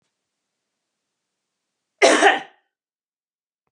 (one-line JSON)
{"cough_length": "3.7 s", "cough_amplitude": 31391, "cough_signal_mean_std_ratio": 0.24, "survey_phase": "beta (2021-08-13 to 2022-03-07)", "age": "45-64", "gender": "Female", "wearing_mask": "No", "symptom_none": true, "smoker_status": "Never smoked", "respiratory_condition_asthma": false, "respiratory_condition_other": false, "recruitment_source": "REACT", "submission_delay": "1 day", "covid_test_result": "Negative", "covid_test_method": "RT-qPCR", "influenza_a_test_result": "Negative", "influenza_b_test_result": "Negative"}